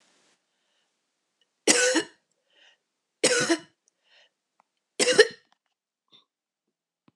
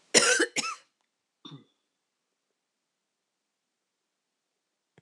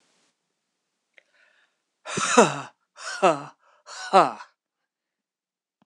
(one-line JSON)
{"three_cough_length": "7.2 s", "three_cough_amplitude": 25685, "three_cough_signal_mean_std_ratio": 0.27, "cough_length": "5.0 s", "cough_amplitude": 19480, "cough_signal_mean_std_ratio": 0.23, "exhalation_length": "5.9 s", "exhalation_amplitude": 25889, "exhalation_signal_mean_std_ratio": 0.27, "survey_phase": "beta (2021-08-13 to 2022-03-07)", "age": "65+", "gender": "Female", "wearing_mask": "No", "symptom_new_continuous_cough": true, "symptom_runny_or_blocked_nose": true, "symptom_fatigue": true, "smoker_status": "Ex-smoker", "respiratory_condition_asthma": true, "respiratory_condition_other": false, "recruitment_source": "Test and Trace", "submission_delay": "1 day", "covid_test_result": "Positive", "covid_test_method": "RT-qPCR", "covid_ct_value": 27.2, "covid_ct_gene": "ORF1ab gene", "covid_ct_mean": 28.3, "covid_viral_load": "540 copies/ml", "covid_viral_load_category": "Minimal viral load (< 10K copies/ml)"}